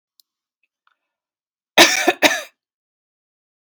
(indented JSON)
{
  "cough_length": "3.7 s",
  "cough_amplitude": 32768,
  "cough_signal_mean_std_ratio": 0.25,
  "survey_phase": "beta (2021-08-13 to 2022-03-07)",
  "age": "18-44",
  "gender": "Female",
  "wearing_mask": "No",
  "symptom_none": true,
  "smoker_status": "Ex-smoker",
  "respiratory_condition_asthma": false,
  "respiratory_condition_other": false,
  "recruitment_source": "REACT",
  "submission_delay": "2 days",
  "covid_test_result": "Negative",
  "covid_test_method": "RT-qPCR"
}